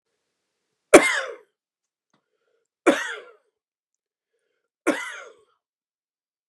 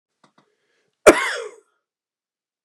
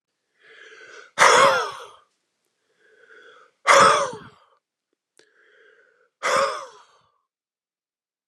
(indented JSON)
{
  "three_cough_length": "6.5 s",
  "three_cough_amplitude": 32768,
  "three_cough_signal_mean_std_ratio": 0.2,
  "cough_length": "2.6 s",
  "cough_amplitude": 32768,
  "cough_signal_mean_std_ratio": 0.2,
  "exhalation_length": "8.3 s",
  "exhalation_amplitude": 29965,
  "exhalation_signal_mean_std_ratio": 0.31,
  "survey_phase": "beta (2021-08-13 to 2022-03-07)",
  "age": "45-64",
  "gender": "Male",
  "wearing_mask": "No",
  "symptom_cough_any": true,
  "symptom_runny_or_blocked_nose": true,
  "symptom_fatigue": true,
  "symptom_headache": true,
  "symptom_onset": "4 days",
  "smoker_status": "Never smoked",
  "respiratory_condition_asthma": false,
  "respiratory_condition_other": false,
  "recruitment_source": "REACT",
  "submission_delay": "0 days",
  "covid_test_result": "Positive",
  "covid_test_method": "RT-qPCR",
  "covid_ct_value": 20.9,
  "covid_ct_gene": "E gene",
  "influenza_a_test_result": "Negative",
  "influenza_b_test_result": "Negative"
}